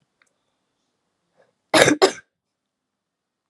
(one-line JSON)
{"cough_length": "3.5 s", "cough_amplitude": 32768, "cough_signal_mean_std_ratio": 0.23, "survey_phase": "alpha (2021-03-01 to 2021-08-12)", "age": "18-44", "gender": "Female", "wearing_mask": "No", "symptom_cough_any": true, "symptom_fever_high_temperature": true, "symptom_headache": true, "smoker_status": "Never smoked", "respiratory_condition_asthma": false, "respiratory_condition_other": false, "recruitment_source": "Test and Trace", "submission_delay": "2 days", "covid_test_result": "Positive", "covid_test_method": "RT-qPCR", "covid_ct_value": 18.4, "covid_ct_gene": "ORF1ab gene", "covid_ct_mean": 18.8, "covid_viral_load": "670000 copies/ml", "covid_viral_load_category": "Low viral load (10K-1M copies/ml)"}